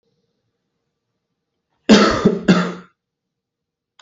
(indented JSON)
{
  "cough_length": "4.0 s",
  "cough_amplitude": 30611,
  "cough_signal_mean_std_ratio": 0.32,
  "survey_phase": "beta (2021-08-13 to 2022-03-07)",
  "age": "18-44",
  "gender": "Male",
  "wearing_mask": "No",
  "symptom_none": true,
  "smoker_status": "Never smoked",
  "respiratory_condition_asthma": false,
  "respiratory_condition_other": false,
  "recruitment_source": "REACT",
  "submission_delay": "1 day",
  "covid_test_result": "Negative",
  "covid_test_method": "RT-qPCR"
}